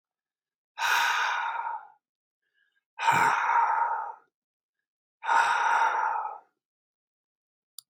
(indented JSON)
{
  "exhalation_length": "7.9 s",
  "exhalation_amplitude": 9956,
  "exhalation_signal_mean_std_ratio": 0.54,
  "survey_phase": "beta (2021-08-13 to 2022-03-07)",
  "age": "65+",
  "gender": "Male",
  "wearing_mask": "No",
  "symptom_none": true,
  "smoker_status": "Never smoked",
  "respiratory_condition_asthma": false,
  "respiratory_condition_other": false,
  "recruitment_source": "REACT",
  "submission_delay": "2 days",
  "covid_test_result": "Negative",
  "covid_test_method": "RT-qPCR",
  "influenza_a_test_result": "Negative",
  "influenza_b_test_result": "Negative"
}